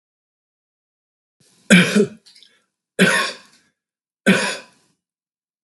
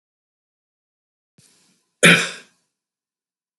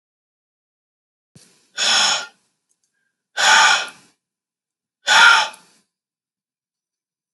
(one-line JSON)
{"three_cough_length": "5.6 s", "three_cough_amplitude": 32768, "three_cough_signal_mean_std_ratio": 0.31, "cough_length": "3.6 s", "cough_amplitude": 32768, "cough_signal_mean_std_ratio": 0.19, "exhalation_length": "7.3 s", "exhalation_amplitude": 32768, "exhalation_signal_mean_std_ratio": 0.33, "survey_phase": "beta (2021-08-13 to 2022-03-07)", "age": "65+", "gender": "Male", "wearing_mask": "No", "symptom_none": true, "smoker_status": "Never smoked", "respiratory_condition_asthma": false, "respiratory_condition_other": false, "recruitment_source": "REACT", "submission_delay": "1 day", "covid_test_result": "Negative", "covid_test_method": "RT-qPCR", "influenza_a_test_result": "Negative", "influenza_b_test_result": "Negative"}